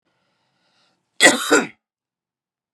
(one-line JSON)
{"cough_length": "2.7 s", "cough_amplitude": 32768, "cough_signal_mean_std_ratio": 0.27, "survey_phase": "beta (2021-08-13 to 2022-03-07)", "age": "45-64", "gender": "Male", "wearing_mask": "No", "symptom_cough_any": true, "symptom_sore_throat": true, "symptom_headache": true, "smoker_status": "Never smoked", "respiratory_condition_asthma": false, "respiratory_condition_other": false, "recruitment_source": "REACT", "submission_delay": "2 days", "covid_test_result": "Negative", "covid_test_method": "RT-qPCR", "influenza_a_test_result": "Negative", "influenza_b_test_result": "Negative"}